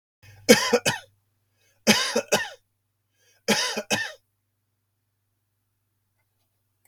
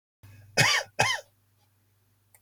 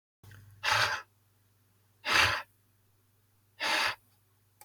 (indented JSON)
{
  "three_cough_length": "6.9 s",
  "three_cough_amplitude": 32374,
  "three_cough_signal_mean_std_ratio": 0.31,
  "cough_length": "2.4 s",
  "cough_amplitude": 15102,
  "cough_signal_mean_std_ratio": 0.35,
  "exhalation_length": "4.6 s",
  "exhalation_amplitude": 9243,
  "exhalation_signal_mean_std_ratio": 0.39,
  "survey_phase": "beta (2021-08-13 to 2022-03-07)",
  "age": "65+",
  "gender": "Male",
  "wearing_mask": "No",
  "symptom_none": true,
  "smoker_status": "Never smoked",
  "respiratory_condition_asthma": false,
  "respiratory_condition_other": false,
  "recruitment_source": "REACT",
  "submission_delay": "2 days",
  "covid_test_result": "Negative",
  "covid_test_method": "RT-qPCR",
  "influenza_a_test_result": "Negative",
  "influenza_b_test_result": "Negative"
}